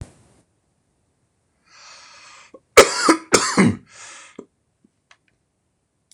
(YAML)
cough_length: 6.1 s
cough_amplitude: 26028
cough_signal_mean_std_ratio: 0.26
survey_phase: beta (2021-08-13 to 2022-03-07)
age: 65+
gender: Male
wearing_mask: 'No'
symptom_cough_any: true
symptom_runny_or_blocked_nose: true
symptom_headache: true
smoker_status: Ex-smoker
respiratory_condition_asthma: false
respiratory_condition_other: false
recruitment_source: Test and Trace
submission_delay: 1 day
covid_test_result: Positive
covid_test_method: LFT